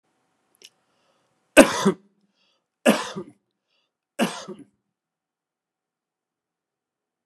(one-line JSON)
{"three_cough_length": "7.3 s", "three_cough_amplitude": 32768, "three_cough_signal_mean_std_ratio": 0.19, "survey_phase": "beta (2021-08-13 to 2022-03-07)", "age": "45-64", "gender": "Male", "wearing_mask": "No", "symptom_none": true, "smoker_status": "Never smoked", "respiratory_condition_asthma": false, "respiratory_condition_other": false, "recruitment_source": "REACT", "submission_delay": "2 days", "covid_test_result": "Negative", "covid_test_method": "RT-qPCR"}